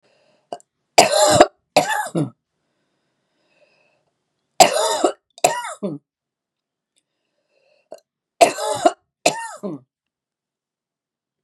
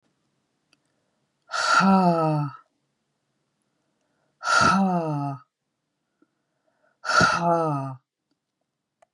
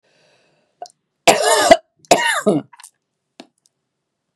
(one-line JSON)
{"three_cough_length": "11.4 s", "three_cough_amplitude": 32768, "three_cough_signal_mean_std_ratio": 0.31, "exhalation_length": "9.1 s", "exhalation_amplitude": 18323, "exhalation_signal_mean_std_ratio": 0.44, "cough_length": "4.4 s", "cough_amplitude": 32768, "cough_signal_mean_std_ratio": 0.34, "survey_phase": "beta (2021-08-13 to 2022-03-07)", "age": "45-64", "gender": "Female", "wearing_mask": "No", "symptom_none": true, "smoker_status": "Never smoked", "respiratory_condition_asthma": false, "respiratory_condition_other": false, "recruitment_source": "REACT", "submission_delay": "1 day", "covid_test_result": "Negative", "covid_test_method": "RT-qPCR", "influenza_a_test_result": "Negative", "influenza_b_test_result": "Negative"}